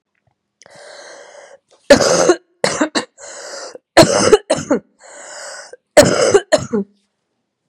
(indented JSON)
{
  "three_cough_length": "7.7 s",
  "three_cough_amplitude": 32768,
  "three_cough_signal_mean_std_ratio": 0.4,
  "survey_phase": "beta (2021-08-13 to 2022-03-07)",
  "age": "18-44",
  "gender": "Female",
  "wearing_mask": "No",
  "symptom_cough_any": true,
  "symptom_runny_or_blocked_nose": true,
  "symptom_sore_throat": true,
  "symptom_onset": "3 days",
  "smoker_status": "Current smoker (1 to 10 cigarettes per day)",
  "respiratory_condition_asthma": false,
  "respiratory_condition_other": false,
  "recruitment_source": "Test and Trace",
  "submission_delay": "1 day",
  "covid_test_result": "Negative",
  "covid_test_method": "RT-qPCR"
}